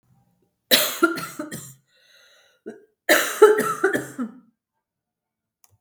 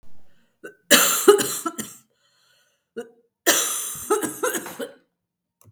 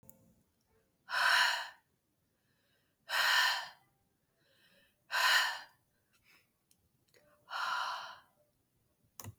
{"cough_length": "5.8 s", "cough_amplitude": 32766, "cough_signal_mean_std_ratio": 0.35, "three_cough_length": "5.7 s", "three_cough_amplitude": 32711, "three_cough_signal_mean_std_ratio": 0.41, "exhalation_length": "9.4 s", "exhalation_amplitude": 4851, "exhalation_signal_mean_std_ratio": 0.38, "survey_phase": "beta (2021-08-13 to 2022-03-07)", "age": "45-64", "gender": "Female", "wearing_mask": "No", "symptom_cough_any": true, "symptom_runny_or_blocked_nose": true, "symptom_sore_throat": true, "symptom_fatigue": true, "symptom_fever_high_temperature": true, "symptom_change_to_sense_of_smell_or_taste": true, "symptom_onset": "5 days", "smoker_status": "Never smoked", "respiratory_condition_asthma": false, "respiratory_condition_other": false, "recruitment_source": "Test and Trace", "submission_delay": "1 day", "covid_test_result": "Positive", "covid_test_method": "RT-qPCR", "covid_ct_value": 16.1, "covid_ct_gene": "ORF1ab gene", "covid_ct_mean": 16.4, "covid_viral_load": "4200000 copies/ml", "covid_viral_load_category": "High viral load (>1M copies/ml)"}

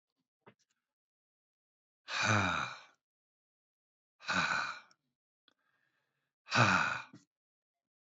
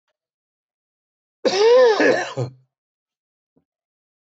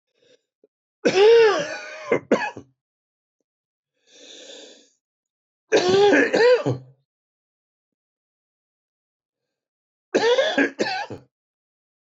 {"exhalation_length": "8.0 s", "exhalation_amplitude": 6927, "exhalation_signal_mean_std_ratio": 0.34, "cough_length": "4.3 s", "cough_amplitude": 17501, "cough_signal_mean_std_ratio": 0.38, "three_cough_length": "12.1 s", "three_cough_amplitude": 17351, "three_cough_signal_mean_std_ratio": 0.39, "survey_phase": "beta (2021-08-13 to 2022-03-07)", "age": "45-64", "gender": "Male", "wearing_mask": "No", "symptom_cough_any": true, "symptom_runny_or_blocked_nose": true, "symptom_sore_throat": true, "symptom_onset": "3 days", "smoker_status": "Ex-smoker", "respiratory_condition_asthma": false, "respiratory_condition_other": false, "recruitment_source": "Test and Trace", "submission_delay": "1 day", "covid_test_result": "Positive", "covid_test_method": "RT-qPCR", "covid_ct_value": 26.8, "covid_ct_gene": "ORF1ab gene", "covid_ct_mean": 27.0, "covid_viral_load": "1400 copies/ml", "covid_viral_load_category": "Minimal viral load (< 10K copies/ml)"}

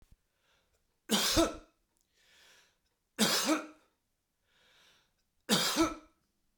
{"three_cough_length": "6.6 s", "three_cough_amplitude": 7809, "three_cough_signal_mean_std_ratio": 0.36, "survey_phase": "beta (2021-08-13 to 2022-03-07)", "age": "45-64", "gender": "Male", "wearing_mask": "No", "symptom_none": true, "smoker_status": "Never smoked", "respiratory_condition_asthma": false, "respiratory_condition_other": false, "recruitment_source": "REACT", "submission_delay": "3 days", "covid_test_result": "Negative", "covid_test_method": "RT-qPCR", "influenza_a_test_result": "Negative", "influenza_b_test_result": "Negative"}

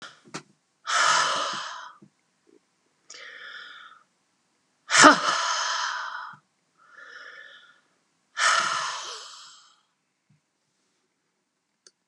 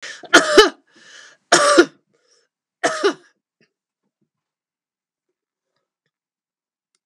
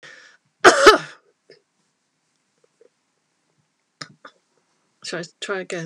{"exhalation_length": "12.1 s", "exhalation_amplitude": 32762, "exhalation_signal_mean_std_ratio": 0.34, "three_cough_length": "7.1 s", "three_cough_amplitude": 32768, "three_cough_signal_mean_std_ratio": 0.26, "cough_length": "5.9 s", "cough_amplitude": 32768, "cough_signal_mean_std_ratio": 0.22, "survey_phase": "beta (2021-08-13 to 2022-03-07)", "age": "65+", "gender": "Female", "wearing_mask": "No", "symptom_cough_any": true, "smoker_status": "Never smoked", "respiratory_condition_asthma": false, "respiratory_condition_other": false, "recruitment_source": "REACT", "submission_delay": "1 day", "covid_test_result": "Negative", "covid_test_method": "RT-qPCR", "influenza_a_test_result": "Negative", "influenza_b_test_result": "Negative"}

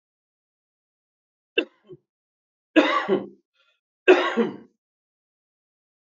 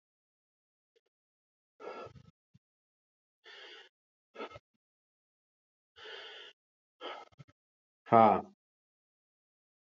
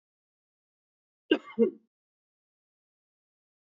{"three_cough_length": "6.1 s", "three_cough_amplitude": 25618, "three_cough_signal_mean_std_ratio": 0.27, "exhalation_length": "9.9 s", "exhalation_amplitude": 10809, "exhalation_signal_mean_std_ratio": 0.16, "cough_length": "3.8 s", "cough_amplitude": 10873, "cough_signal_mean_std_ratio": 0.17, "survey_phase": "alpha (2021-03-01 to 2021-08-12)", "age": "45-64", "gender": "Male", "wearing_mask": "No", "symptom_none": true, "smoker_status": "Ex-smoker", "respiratory_condition_asthma": false, "respiratory_condition_other": false, "recruitment_source": "REACT", "submission_delay": "2 days", "covid_test_result": "Negative", "covid_test_method": "RT-qPCR"}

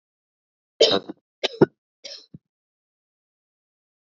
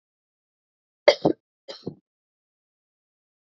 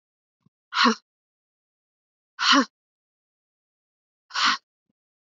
{"three_cough_length": "4.2 s", "three_cough_amplitude": 26161, "three_cough_signal_mean_std_ratio": 0.2, "cough_length": "3.5 s", "cough_amplitude": 27763, "cough_signal_mean_std_ratio": 0.15, "exhalation_length": "5.4 s", "exhalation_amplitude": 17995, "exhalation_signal_mean_std_ratio": 0.27, "survey_phase": "beta (2021-08-13 to 2022-03-07)", "age": "18-44", "gender": "Female", "wearing_mask": "No", "symptom_runny_or_blocked_nose": true, "smoker_status": "Never smoked", "respiratory_condition_asthma": false, "respiratory_condition_other": false, "recruitment_source": "REACT", "submission_delay": "2 days", "covid_test_result": "Negative", "covid_test_method": "RT-qPCR", "influenza_a_test_result": "Negative", "influenza_b_test_result": "Negative"}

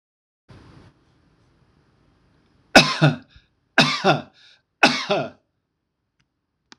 {"three_cough_length": "6.8 s", "three_cough_amplitude": 26028, "three_cough_signal_mean_std_ratio": 0.28, "survey_phase": "alpha (2021-03-01 to 2021-08-12)", "age": "45-64", "gender": "Male", "wearing_mask": "No", "symptom_none": true, "smoker_status": "Never smoked", "respiratory_condition_asthma": false, "respiratory_condition_other": false, "recruitment_source": "REACT", "submission_delay": "3 days", "covid_test_result": "Negative", "covid_test_method": "RT-qPCR"}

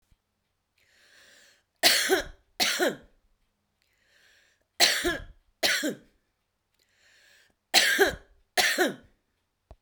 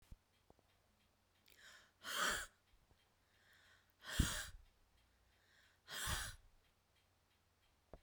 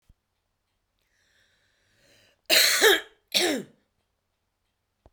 {"three_cough_length": "9.8 s", "three_cough_amplitude": 20454, "three_cough_signal_mean_std_ratio": 0.37, "exhalation_length": "8.0 s", "exhalation_amplitude": 3150, "exhalation_signal_mean_std_ratio": 0.33, "cough_length": "5.1 s", "cough_amplitude": 23224, "cough_signal_mean_std_ratio": 0.3, "survey_phase": "beta (2021-08-13 to 2022-03-07)", "age": "45-64", "gender": "Female", "wearing_mask": "No", "symptom_none": true, "smoker_status": "Current smoker (11 or more cigarettes per day)", "respiratory_condition_asthma": false, "respiratory_condition_other": false, "recruitment_source": "REACT", "submission_delay": "2 days", "covid_test_result": "Negative", "covid_test_method": "RT-qPCR", "influenza_a_test_result": "Negative", "influenza_b_test_result": "Negative"}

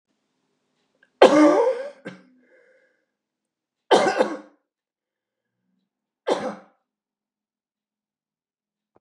{"three_cough_length": "9.0 s", "three_cough_amplitude": 32126, "three_cough_signal_mean_std_ratio": 0.27, "survey_phase": "beta (2021-08-13 to 2022-03-07)", "age": "65+", "gender": "Male", "wearing_mask": "No", "symptom_none": true, "smoker_status": "Ex-smoker", "respiratory_condition_asthma": false, "respiratory_condition_other": true, "recruitment_source": "REACT", "submission_delay": "4 days", "covid_test_result": "Negative", "covid_test_method": "RT-qPCR", "influenza_a_test_result": "Negative", "influenza_b_test_result": "Negative"}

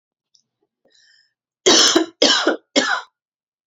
{"three_cough_length": "3.7 s", "three_cough_amplitude": 32036, "three_cough_signal_mean_std_ratio": 0.4, "survey_phase": "beta (2021-08-13 to 2022-03-07)", "age": "45-64", "gender": "Female", "wearing_mask": "No", "symptom_cough_any": true, "symptom_runny_or_blocked_nose": true, "symptom_sore_throat": true, "symptom_other": true, "smoker_status": "Never smoked", "respiratory_condition_asthma": true, "respiratory_condition_other": false, "recruitment_source": "Test and Trace", "submission_delay": "0 days", "covid_test_result": "Positive", "covid_test_method": "LFT"}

